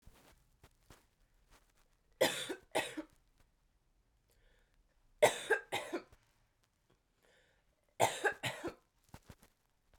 three_cough_length: 10.0 s
three_cough_amplitude: 6510
three_cough_signal_mean_std_ratio: 0.27
survey_phase: beta (2021-08-13 to 2022-03-07)
age: 18-44
gender: Female
wearing_mask: 'No'
symptom_cough_any: true
symptom_runny_or_blocked_nose: true
symptom_fatigue: true
symptom_fever_high_temperature: true
symptom_headache: true
symptom_change_to_sense_of_smell_or_taste: true
symptom_other: true
symptom_onset: 2 days
smoker_status: Ex-smoker
respiratory_condition_asthma: false
respiratory_condition_other: false
recruitment_source: Test and Trace
submission_delay: 2 days
covid_test_result: Positive
covid_test_method: RT-qPCR
covid_ct_value: 15.4
covid_ct_gene: ORF1ab gene
covid_ct_mean: 16.9
covid_viral_load: 3000000 copies/ml
covid_viral_load_category: High viral load (>1M copies/ml)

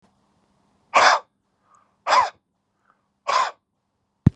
exhalation_length: 4.4 s
exhalation_amplitude: 30227
exhalation_signal_mean_std_ratio: 0.3
survey_phase: beta (2021-08-13 to 2022-03-07)
age: 45-64
gender: Male
wearing_mask: 'No'
symptom_fever_high_temperature: true
smoker_status: Never smoked
respiratory_condition_asthma: false
respiratory_condition_other: false
recruitment_source: REACT
submission_delay: 10 days
covid_test_result: Negative
covid_test_method: RT-qPCR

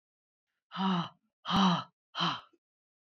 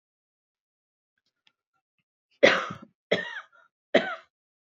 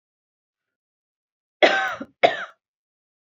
exhalation_length: 3.2 s
exhalation_amplitude: 6228
exhalation_signal_mean_std_ratio: 0.44
three_cough_length: 4.7 s
three_cough_amplitude: 25608
three_cough_signal_mean_std_ratio: 0.23
cough_length: 3.2 s
cough_amplitude: 27486
cough_signal_mean_std_ratio: 0.26
survey_phase: beta (2021-08-13 to 2022-03-07)
age: 45-64
gender: Female
wearing_mask: 'No'
symptom_cough_any: true
smoker_status: Never smoked
respiratory_condition_asthma: false
respiratory_condition_other: false
recruitment_source: REACT
submission_delay: 5 days
covid_test_result: Negative
covid_test_method: RT-qPCR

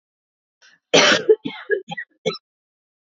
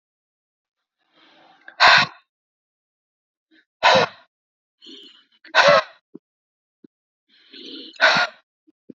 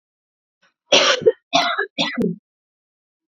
cough_length: 3.2 s
cough_amplitude: 31753
cough_signal_mean_std_ratio: 0.34
exhalation_length: 9.0 s
exhalation_amplitude: 32767
exhalation_signal_mean_std_ratio: 0.28
three_cough_length: 3.3 s
three_cough_amplitude: 30977
three_cough_signal_mean_std_ratio: 0.41
survey_phase: alpha (2021-03-01 to 2021-08-12)
age: 45-64
gender: Female
wearing_mask: 'No'
symptom_none: true
smoker_status: Current smoker (1 to 10 cigarettes per day)
respiratory_condition_asthma: false
respiratory_condition_other: false
recruitment_source: Test and Trace
submission_delay: 0 days
covid_test_result: Negative
covid_test_method: LFT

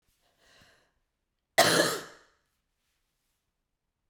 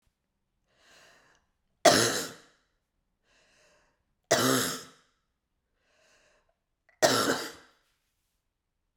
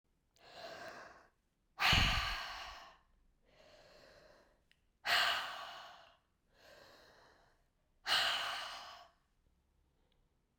cough_length: 4.1 s
cough_amplitude: 15054
cough_signal_mean_std_ratio: 0.24
three_cough_length: 9.0 s
three_cough_amplitude: 16693
three_cough_signal_mean_std_ratio: 0.28
exhalation_length: 10.6 s
exhalation_amplitude: 4296
exhalation_signal_mean_std_ratio: 0.38
survey_phase: beta (2021-08-13 to 2022-03-07)
age: 45-64
gender: Female
wearing_mask: 'No'
symptom_cough_any: true
symptom_runny_or_blocked_nose: true
symptom_sore_throat: true
symptom_headache: true
smoker_status: Never smoked
respiratory_condition_asthma: false
respiratory_condition_other: false
recruitment_source: Test and Trace
submission_delay: 3 days
covid_test_result: Positive
covid_test_method: RT-qPCR
covid_ct_value: 33.2
covid_ct_gene: ORF1ab gene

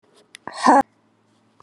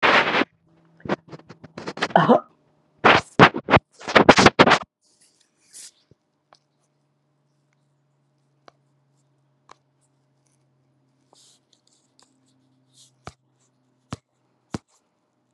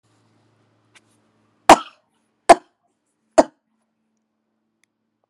exhalation_length: 1.6 s
exhalation_amplitude: 28920
exhalation_signal_mean_std_ratio: 0.29
three_cough_length: 15.5 s
three_cough_amplitude: 32768
three_cough_signal_mean_std_ratio: 0.24
cough_length: 5.3 s
cough_amplitude: 32768
cough_signal_mean_std_ratio: 0.14
survey_phase: beta (2021-08-13 to 2022-03-07)
age: 65+
gender: Female
wearing_mask: 'No'
symptom_cough_any: true
symptom_diarrhoea: true
symptom_fatigue: true
symptom_headache: true
smoker_status: Never smoked
respiratory_condition_asthma: false
respiratory_condition_other: false
recruitment_source: Test and Trace
submission_delay: 5 days
covid_test_result: Positive
covid_test_method: RT-qPCR
covid_ct_value: 15.7
covid_ct_gene: ORF1ab gene
covid_ct_mean: 16.1
covid_viral_load: 5300000 copies/ml
covid_viral_load_category: High viral load (>1M copies/ml)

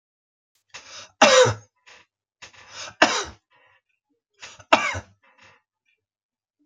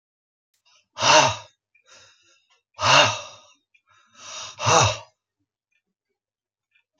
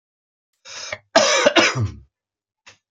three_cough_length: 6.7 s
three_cough_amplitude: 30737
three_cough_signal_mean_std_ratio: 0.26
exhalation_length: 7.0 s
exhalation_amplitude: 27898
exhalation_signal_mean_std_ratio: 0.31
cough_length: 2.9 s
cough_amplitude: 28769
cough_signal_mean_std_ratio: 0.41
survey_phase: beta (2021-08-13 to 2022-03-07)
age: 65+
gender: Male
wearing_mask: 'No'
symptom_runny_or_blocked_nose: true
smoker_status: Ex-smoker
respiratory_condition_asthma: false
respiratory_condition_other: false
recruitment_source: REACT
submission_delay: 2 days
covid_test_result: Negative
covid_test_method: RT-qPCR
influenza_a_test_result: Negative
influenza_b_test_result: Negative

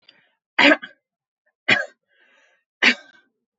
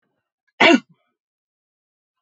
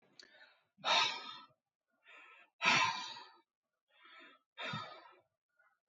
three_cough_length: 3.6 s
three_cough_amplitude: 27919
three_cough_signal_mean_std_ratio: 0.27
cough_length: 2.2 s
cough_amplitude: 28467
cough_signal_mean_std_ratio: 0.23
exhalation_length: 5.9 s
exhalation_amplitude: 5785
exhalation_signal_mean_std_ratio: 0.35
survey_phase: beta (2021-08-13 to 2022-03-07)
age: 18-44
gender: Female
wearing_mask: 'No'
symptom_none: true
smoker_status: Never smoked
respiratory_condition_asthma: false
respiratory_condition_other: false
recruitment_source: REACT
submission_delay: 4 days
covid_test_result: Negative
covid_test_method: RT-qPCR
influenza_a_test_result: Negative
influenza_b_test_result: Negative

